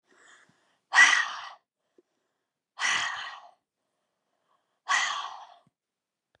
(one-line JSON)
{"exhalation_length": "6.4 s", "exhalation_amplitude": 18735, "exhalation_signal_mean_std_ratio": 0.31, "survey_phase": "beta (2021-08-13 to 2022-03-07)", "age": "45-64", "gender": "Female", "wearing_mask": "No", "symptom_runny_or_blocked_nose": true, "symptom_fatigue": true, "symptom_headache": true, "symptom_change_to_sense_of_smell_or_taste": true, "smoker_status": "Never smoked", "respiratory_condition_asthma": true, "respiratory_condition_other": false, "recruitment_source": "Test and Trace", "submission_delay": "2 days", "covid_test_result": "Positive", "covid_test_method": "ePCR"}